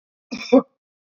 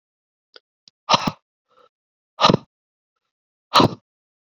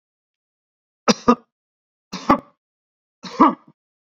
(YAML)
cough_length: 1.2 s
cough_amplitude: 26771
cough_signal_mean_std_ratio: 0.25
exhalation_length: 4.5 s
exhalation_amplitude: 32644
exhalation_signal_mean_std_ratio: 0.23
three_cough_length: 4.0 s
three_cough_amplitude: 31336
three_cough_signal_mean_std_ratio: 0.24
survey_phase: beta (2021-08-13 to 2022-03-07)
age: 45-64
gender: Male
wearing_mask: 'No'
symptom_none: true
smoker_status: Ex-smoker
respiratory_condition_asthma: false
respiratory_condition_other: false
recruitment_source: REACT
submission_delay: 6 days
covid_test_result: Negative
covid_test_method: RT-qPCR